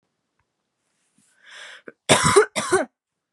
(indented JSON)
{
  "cough_length": "3.3 s",
  "cough_amplitude": 32538,
  "cough_signal_mean_std_ratio": 0.32,
  "survey_phase": "beta (2021-08-13 to 2022-03-07)",
  "age": "18-44",
  "gender": "Female",
  "wearing_mask": "No",
  "symptom_cough_any": true,
  "symptom_sore_throat": true,
  "smoker_status": "Never smoked",
  "respiratory_condition_asthma": true,
  "respiratory_condition_other": false,
  "recruitment_source": "REACT",
  "submission_delay": "2 days",
  "covid_test_result": "Negative",
  "covid_test_method": "RT-qPCR",
  "influenza_a_test_result": "Negative",
  "influenza_b_test_result": "Negative"
}